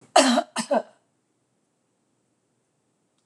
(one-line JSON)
{"cough_length": "3.3 s", "cough_amplitude": 23765, "cough_signal_mean_std_ratio": 0.28, "survey_phase": "beta (2021-08-13 to 2022-03-07)", "age": "45-64", "gender": "Female", "wearing_mask": "No", "symptom_none": true, "smoker_status": "Never smoked", "respiratory_condition_asthma": false, "respiratory_condition_other": false, "recruitment_source": "REACT", "submission_delay": "3 days", "covid_test_result": "Negative", "covid_test_method": "RT-qPCR", "influenza_a_test_result": "Negative", "influenza_b_test_result": "Negative"}